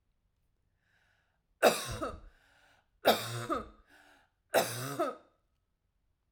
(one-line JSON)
{"three_cough_length": "6.3 s", "three_cough_amplitude": 10964, "three_cough_signal_mean_std_ratio": 0.33, "survey_phase": "alpha (2021-03-01 to 2021-08-12)", "age": "18-44", "gender": "Female", "wearing_mask": "No", "symptom_none": true, "smoker_status": "Ex-smoker", "respiratory_condition_asthma": false, "respiratory_condition_other": false, "recruitment_source": "REACT", "submission_delay": "1 day", "covid_test_result": "Negative", "covid_test_method": "RT-qPCR"}